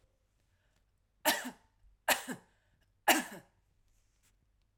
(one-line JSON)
{"three_cough_length": "4.8 s", "three_cough_amplitude": 9036, "three_cough_signal_mean_std_ratio": 0.25, "survey_phase": "alpha (2021-03-01 to 2021-08-12)", "age": "45-64", "gender": "Female", "wearing_mask": "No", "symptom_none": true, "symptom_onset": "8 days", "smoker_status": "Ex-smoker", "respiratory_condition_asthma": false, "respiratory_condition_other": false, "recruitment_source": "REACT", "submission_delay": "4 days", "covid_test_result": "Negative", "covid_test_method": "RT-qPCR"}